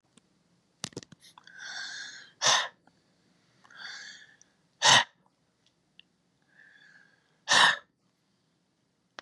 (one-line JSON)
{"exhalation_length": "9.2 s", "exhalation_amplitude": 16464, "exhalation_signal_mean_std_ratio": 0.26, "survey_phase": "beta (2021-08-13 to 2022-03-07)", "age": "65+", "gender": "Male", "wearing_mask": "No", "symptom_none": true, "smoker_status": "Never smoked", "respiratory_condition_asthma": false, "respiratory_condition_other": false, "recruitment_source": "REACT", "submission_delay": "2 days", "covid_test_result": "Negative", "covid_test_method": "RT-qPCR", "influenza_a_test_result": "Negative", "influenza_b_test_result": "Negative"}